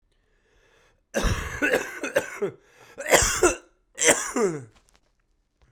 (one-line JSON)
{"three_cough_length": "5.7 s", "three_cough_amplitude": 29827, "three_cough_signal_mean_std_ratio": 0.45, "survey_phase": "beta (2021-08-13 to 2022-03-07)", "age": "18-44", "gender": "Male", "wearing_mask": "No", "symptom_new_continuous_cough": true, "symptom_sore_throat": true, "symptom_fatigue": true, "symptom_headache": true, "symptom_change_to_sense_of_smell_or_taste": true, "symptom_loss_of_taste": true, "symptom_other": true, "symptom_onset": "3 days", "smoker_status": "Never smoked", "respiratory_condition_asthma": false, "respiratory_condition_other": false, "recruitment_source": "Test and Trace", "submission_delay": "1 day", "covid_test_result": "Positive", "covid_test_method": "RT-qPCR", "covid_ct_value": 20.7, "covid_ct_gene": "ORF1ab gene", "covid_ct_mean": 21.3, "covid_viral_load": "100000 copies/ml", "covid_viral_load_category": "Low viral load (10K-1M copies/ml)"}